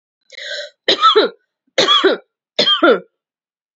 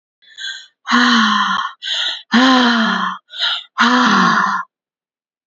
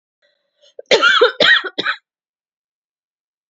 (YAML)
three_cough_length: 3.8 s
three_cough_amplitude: 32767
three_cough_signal_mean_std_ratio: 0.48
exhalation_length: 5.5 s
exhalation_amplitude: 31891
exhalation_signal_mean_std_ratio: 0.69
cough_length: 3.5 s
cough_amplitude: 30822
cough_signal_mean_std_ratio: 0.38
survey_phase: alpha (2021-03-01 to 2021-08-12)
age: 18-44
gender: Female
wearing_mask: 'No'
symptom_none: true
smoker_status: Never smoked
respiratory_condition_asthma: false
respiratory_condition_other: false
recruitment_source: REACT
submission_delay: 1 day
covid_test_result: Negative
covid_test_method: RT-qPCR